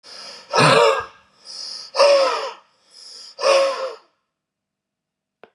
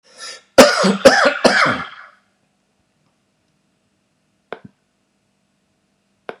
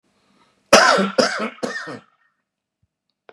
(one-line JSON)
{"exhalation_length": "5.5 s", "exhalation_amplitude": 27332, "exhalation_signal_mean_std_ratio": 0.46, "three_cough_length": "6.4 s", "three_cough_amplitude": 32768, "three_cough_signal_mean_std_ratio": 0.31, "cough_length": "3.3 s", "cough_amplitude": 32768, "cough_signal_mean_std_ratio": 0.36, "survey_phase": "beta (2021-08-13 to 2022-03-07)", "age": "65+", "gender": "Male", "wearing_mask": "No", "symptom_none": true, "smoker_status": "Ex-smoker", "respiratory_condition_asthma": false, "respiratory_condition_other": false, "recruitment_source": "REACT", "submission_delay": "1 day", "covid_test_result": "Negative", "covid_test_method": "RT-qPCR"}